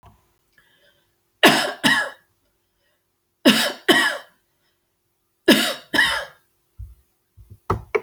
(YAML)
three_cough_length: 8.0 s
three_cough_amplitude: 32768
three_cough_signal_mean_std_ratio: 0.35
survey_phase: alpha (2021-03-01 to 2021-08-12)
age: 65+
gender: Female
wearing_mask: 'No'
symptom_none: true
smoker_status: Never smoked
respiratory_condition_asthma: false
respiratory_condition_other: false
recruitment_source: REACT
submission_delay: 2 days
covid_test_result: Negative
covid_test_method: RT-qPCR